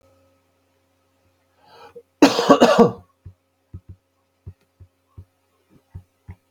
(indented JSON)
{
  "cough_length": "6.5 s",
  "cough_amplitude": 32768,
  "cough_signal_mean_std_ratio": 0.24,
  "survey_phase": "beta (2021-08-13 to 2022-03-07)",
  "age": "45-64",
  "gender": "Male",
  "wearing_mask": "No",
  "symptom_cough_any": true,
  "symptom_fever_high_temperature": true,
  "symptom_onset": "6 days",
  "smoker_status": "Ex-smoker",
  "respiratory_condition_asthma": false,
  "respiratory_condition_other": false,
  "recruitment_source": "Test and Trace",
  "submission_delay": "1 day",
  "covid_test_result": "Positive",
  "covid_test_method": "RT-qPCR",
  "covid_ct_value": 18.8,
  "covid_ct_gene": "N gene"
}